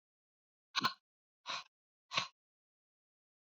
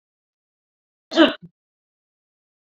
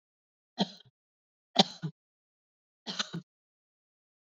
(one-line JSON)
{"exhalation_length": "3.4 s", "exhalation_amplitude": 4742, "exhalation_signal_mean_std_ratio": 0.24, "cough_length": "2.7 s", "cough_amplitude": 26427, "cough_signal_mean_std_ratio": 0.19, "three_cough_length": "4.3 s", "three_cough_amplitude": 16076, "three_cough_signal_mean_std_ratio": 0.19, "survey_phase": "beta (2021-08-13 to 2022-03-07)", "age": "65+", "gender": "Female", "wearing_mask": "No", "symptom_none": true, "smoker_status": "Never smoked", "respiratory_condition_asthma": false, "respiratory_condition_other": false, "recruitment_source": "REACT", "submission_delay": "2 days", "covid_test_result": "Negative", "covid_test_method": "RT-qPCR"}